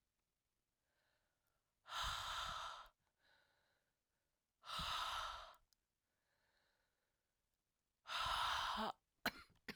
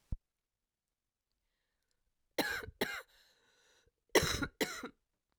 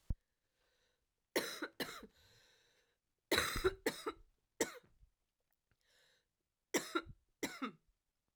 {"exhalation_length": "9.8 s", "exhalation_amplitude": 1560, "exhalation_signal_mean_std_ratio": 0.44, "cough_length": "5.4 s", "cough_amplitude": 7273, "cough_signal_mean_std_ratio": 0.29, "three_cough_length": "8.4 s", "three_cough_amplitude": 4104, "three_cough_signal_mean_std_ratio": 0.32, "survey_phase": "beta (2021-08-13 to 2022-03-07)", "age": "18-44", "gender": "Female", "wearing_mask": "No", "symptom_cough_any": true, "symptom_new_continuous_cough": true, "symptom_runny_or_blocked_nose": true, "symptom_shortness_of_breath": true, "symptom_sore_throat": true, "symptom_fatigue": true, "symptom_onset": "4 days", "smoker_status": "Never smoked", "respiratory_condition_asthma": false, "respiratory_condition_other": false, "recruitment_source": "Test and Trace", "submission_delay": "2 days", "covid_test_result": "Positive", "covid_test_method": "RT-qPCR", "covid_ct_value": 15.3, "covid_ct_gene": "ORF1ab gene", "covid_ct_mean": 15.7, "covid_viral_load": "7100000 copies/ml", "covid_viral_load_category": "High viral load (>1M copies/ml)"}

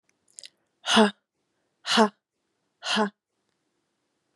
{"exhalation_length": "4.4 s", "exhalation_amplitude": 18484, "exhalation_signal_mean_std_ratio": 0.29, "survey_phase": "beta (2021-08-13 to 2022-03-07)", "age": "18-44", "gender": "Female", "wearing_mask": "No", "symptom_change_to_sense_of_smell_or_taste": true, "smoker_status": "Ex-smoker", "respiratory_condition_asthma": false, "respiratory_condition_other": false, "recruitment_source": "REACT", "submission_delay": "1 day", "covid_test_result": "Negative", "covid_test_method": "RT-qPCR", "influenza_a_test_result": "Negative", "influenza_b_test_result": "Negative"}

